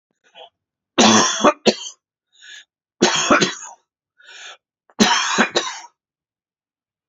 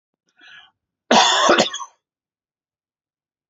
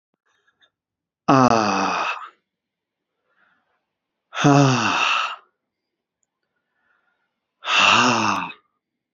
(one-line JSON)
{"three_cough_length": "7.1 s", "three_cough_amplitude": 32768, "three_cough_signal_mean_std_ratio": 0.4, "cough_length": "3.5 s", "cough_amplitude": 28529, "cough_signal_mean_std_ratio": 0.34, "exhalation_length": "9.1 s", "exhalation_amplitude": 28562, "exhalation_signal_mean_std_ratio": 0.41, "survey_phase": "alpha (2021-03-01 to 2021-08-12)", "age": "45-64", "gender": "Male", "wearing_mask": "No", "symptom_new_continuous_cough": true, "symptom_shortness_of_breath": true, "symptom_fatigue": true, "symptom_fever_high_temperature": true, "symptom_headache": true, "symptom_onset": "3 days", "smoker_status": "Never smoked", "respiratory_condition_asthma": false, "respiratory_condition_other": false, "recruitment_source": "Test and Trace", "submission_delay": "2 days", "covid_test_result": "Positive", "covid_test_method": "RT-qPCR", "covid_ct_value": 29.4, "covid_ct_gene": "ORF1ab gene"}